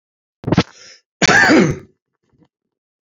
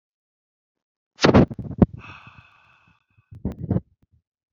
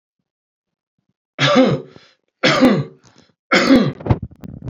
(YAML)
cough_length: 3.1 s
cough_amplitude: 32767
cough_signal_mean_std_ratio: 0.38
exhalation_length: 4.5 s
exhalation_amplitude: 28304
exhalation_signal_mean_std_ratio: 0.25
three_cough_length: 4.7 s
three_cough_amplitude: 30479
three_cough_signal_mean_std_ratio: 0.45
survey_phase: beta (2021-08-13 to 2022-03-07)
age: 45-64
gender: Male
wearing_mask: 'No'
symptom_none: true
smoker_status: Never smoked
respiratory_condition_asthma: false
respiratory_condition_other: false
recruitment_source: REACT
submission_delay: 1 day
covid_test_result: Negative
covid_test_method: RT-qPCR